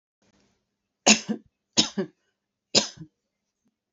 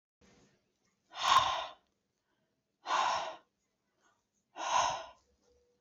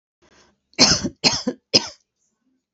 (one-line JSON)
{"three_cough_length": "3.9 s", "three_cough_amplitude": 27714, "three_cough_signal_mean_std_ratio": 0.24, "exhalation_length": "5.8 s", "exhalation_amplitude": 7301, "exhalation_signal_mean_std_ratio": 0.37, "cough_length": "2.7 s", "cough_amplitude": 31485, "cough_signal_mean_std_ratio": 0.34, "survey_phase": "beta (2021-08-13 to 2022-03-07)", "age": "18-44", "gender": "Female", "wearing_mask": "No", "symptom_none": true, "smoker_status": "Current smoker (1 to 10 cigarettes per day)", "respiratory_condition_asthma": false, "respiratory_condition_other": false, "recruitment_source": "REACT", "submission_delay": "1 day", "covid_test_result": "Negative", "covid_test_method": "RT-qPCR", "influenza_a_test_result": "Unknown/Void", "influenza_b_test_result": "Unknown/Void"}